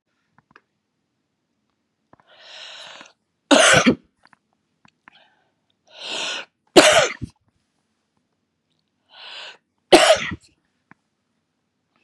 {"three_cough_length": "12.0 s", "three_cough_amplitude": 32768, "three_cough_signal_mean_std_ratio": 0.25, "survey_phase": "beta (2021-08-13 to 2022-03-07)", "age": "45-64", "gender": "Female", "wearing_mask": "No", "symptom_cough_any": true, "symptom_sore_throat": true, "symptom_onset": "3 days", "smoker_status": "Never smoked", "respiratory_condition_asthma": false, "respiratory_condition_other": false, "recruitment_source": "Test and Trace", "submission_delay": "2 days", "covid_test_result": "Positive", "covid_test_method": "RT-qPCR", "covid_ct_value": 20.1, "covid_ct_gene": "ORF1ab gene", "covid_ct_mean": 20.6, "covid_viral_load": "180000 copies/ml", "covid_viral_load_category": "Low viral load (10K-1M copies/ml)"}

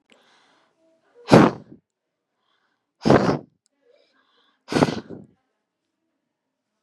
{"exhalation_length": "6.8 s", "exhalation_amplitude": 32768, "exhalation_signal_mean_std_ratio": 0.24, "survey_phase": "beta (2021-08-13 to 2022-03-07)", "age": "18-44", "gender": "Female", "wearing_mask": "No", "symptom_none": true, "smoker_status": "Never smoked", "respiratory_condition_asthma": false, "respiratory_condition_other": false, "recruitment_source": "REACT", "submission_delay": "1 day", "covid_test_result": "Negative", "covid_test_method": "RT-qPCR", "influenza_a_test_result": "Negative", "influenza_b_test_result": "Negative"}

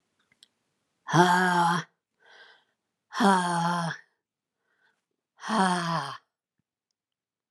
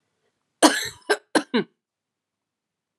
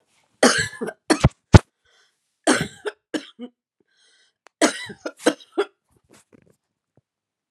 {"exhalation_length": "7.5 s", "exhalation_amplitude": 19984, "exhalation_signal_mean_std_ratio": 0.42, "cough_length": "3.0 s", "cough_amplitude": 31745, "cough_signal_mean_std_ratio": 0.27, "three_cough_length": "7.5 s", "three_cough_amplitude": 32768, "three_cough_signal_mean_std_ratio": 0.24, "survey_phase": "alpha (2021-03-01 to 2021-08-12)", "age": "45-64", "gender": "Female", "wearing_mask": "No", "symptom_cough_any": true, "symptom_fatigue": true, "symptom_headache": true, "smoker_status": "Ex-smoker", "respiratory_condition_asthma": false, "respiratory_condition_other": false, "recruitment_source": "Test and Trace", "submission_delay": "2 days", "covid_test_result": "Positive", "covid_test_method": "LFT"}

